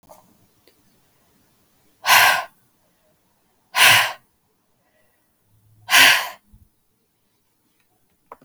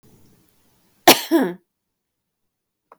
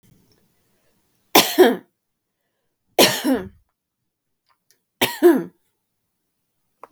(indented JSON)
{
  "exhalation_length": "8.4 s",
  "exhalation_amplitude": 32768,
  "exhalation_signal_mean_std_ratio": 0.28,
  "cough_length": "3.0 s",
  "cough_amplitude": 32768,
  "cough_signal_mean_std_ratio": 0.24,
  "three_cough_length": "6.9 s",
  "three_cough_amplitude": 32768,
  "three_cough_signal_mean_std_ratio": 0.28,
  "survey_phase": "beta (2021-08-13 to 2022-03-07)",
  "age": "45-64",
  "gender": "Female",
  "wearing_mask": "No",
  "symptom_headache": true,
  "symptom_onset": "6 days",
  "smoker_status": "Never smoked",
  "respiratory_condition_asthma": false,
  "respiratory_condition_other": false,
  "recruitment_source": "REACT",
  "submission_delay": "2 days",
  "covid_test_result": "Negative",
  "covid_test_method": "RT-qPCR",
  "influenza_a_test_result": "Negative",
  "influenza_b_test_result": "Negative"
}